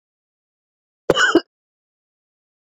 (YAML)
cough_length: 2.7 s
cough_amplitude: 26884
cough_signal_mean_std_ratio: 0.24
survey_phase: beta (2021-08-13 to 2022-03-07)
age: 65+
gender: Female
wearing_mask: 'No'
symptom_runny_or_blocked_nose: true
symptom_headache: true
symptom_other: true
smoker_status: Ex-smoker
respiratory_condition_asthma: false
respiratory_condition_other: false
recruitment_source: Test and Trace
submission_delay: 2 days
covid_test_result: Positive
covid_test_method: RT-qPCR
covid_ct_value: 33.6
covid_ct_gene: N gene